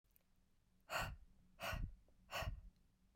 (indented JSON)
{
  "exhalation_length": "3.2 s",
  "exhalation_amplitude": 1115,
  "exhalation_signal_mean_std_ratio": 0.5,
  "survey_phase": "beta (2021-08-13 to 2022-03-07)",
  "age": "18-44",
  "gender": "Female",
  "wearing_mask": "No",
  "symptom_none": true,
  "smoker_status": "Never smoked",
  "respiratory_condition_asthma": true,
  "respiratory_condition_other": false,
  "recruitment_source": "Test and Trace",
  "submission_delay": "2 days",
  "covid_test_result": "Negative",
  "covid_test_method": "RT-qPCR"
}